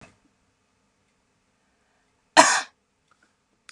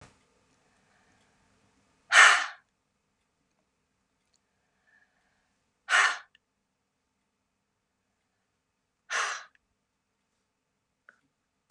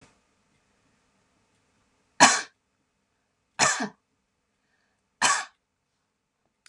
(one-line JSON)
{"cough_length": "3.7 s", "cough_amplitude": 32767, "cough_signal_mean_std_ratio": 0.18, "exhalation_length": "11.7 s", "exhalation_amplitude": 22148, "exhalation_signal_mean_std_ratio": 0.18, "three_cough_length": "6.7 s", "three_cough_amplitude": 30661, "three_cough_signal_mean_std_ratio": 0.22, "survey_phase": "beta (2021-08-13 to 2022-03-07)", "age": "65+", "gender": "Female", "wearing_mask": "No", "symptom_none": true, "smoker_status": "Never smoked", "respiratory_condition_asthma": false, "respiratory_condition_other": false, "recruitment_source": "REACT", "submission_delay": "0 days", "covid_test_result": "Negative", "covid_test_method": "RT-qPCR", "influenza_a_test_result": "Negative", "influenza_b_test_result": "Negative"}